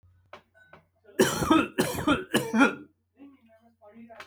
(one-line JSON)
{"three_cough_length": "4.3 s", "three_cough_amplitude": 16125, "three_cough_signal_mean_std_ratio": 0.42, "survey_phase": "beta (2021-08-13 to 2022-03-07)", "age": "45-64", "gender": "Male", "wearing_mask": "No", "symptom_none": true, "smoker_status": "Never smoked", "respiratory_condition_asthma": false, "respiratory_condition_other": false, "recruitment_source": "REACT", "submission_delay": "0 days", "covid_test_result": "Negative", "covid_test_method": "RT-qPCR"}